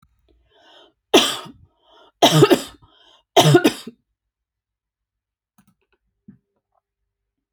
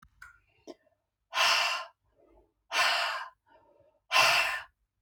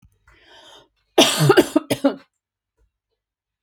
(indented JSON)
{
  "three_cough_length": "7.5 s",
  "three_cough_amplitude": 32103,
  "three_cough_signal_mean_std_ratio": 0.27,
  "exhalation_length": "5.0 s",
  "exhalation_amplitude": 9935,
  "exhalation_signal_mean_std_ratio": 0.45,
  "cough_length": "3.6 s",
  "cough_amplitude": 31126,
  "cough_signal_mean_std_ratio": 0.32,
  "survey_phase": "alpha (2021-03-01 to 2021-08-12)",
  "age": "45-64",
  "gender": "Female",
  "wearing_mask": "No",
  "symptom_none": true,
  "smoker_status": "Never smoked",
  "respiratory_condition_asthma": false,
  "respiratory_condition_other": false,
  "recruitment_source": "REACT",
  "submission_delay": "6 days",
  "covid_test_result": "Negative",
  "covid_test_method": "RT-qPCR"
}